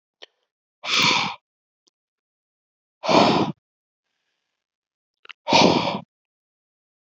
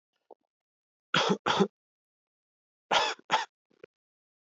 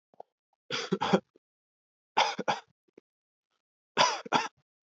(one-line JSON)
{"exhalation_length": "7.1 s", "exhalation_amplitude": 26574, "exhalation_signal_mean_std_ratio": 0.34, "cough_length": "4.4 s", "cough_amplitude": 9617, "cough_signal_mean_std_ratio": 0.32, "three_cough_length": "4.9 s", "three_cough_amplitude": 12426, "three_cough_signal_mean_std_ratio": 0.33, "survey_phase": "alpha (2021-03-01 to 2021-08-12)", "age": "18-44", "gender": "Male", "wearing_mask": "No", "symptom_none": true, "smoker_status": "Never smoked", "respiratory_condition_asthma": false, "respiratory_condition_other": false, "recruitment_source": "Test and Trace", "submission_delay": "2 days", "covid_test_result": "Positive", "covid_test_method": "RT-qPCR"}